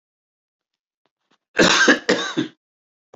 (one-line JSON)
{"cough_length": "3.2 s", "cough_amplitude": 27608, "cough_signal_mean_std_ratio": 0.36, "survey_phase": "beta (2021-08-13 to 2022-03-07)", "age": "65+", "gender": "Male", "wearing_mask": "No", "symptom_none": true, "smoker_status": "Ex-smoker", "respiratory_condition_asthma": false, "respiratory_condition_other": false, "recruitment_source": "REACT", "submission_delay": "2 days", "covid_test_result": "Negative", "covid_test_method": "RT-qPCR", "influenza_a_test_result": "Negative", "influenza_b_test_result": "Negative"}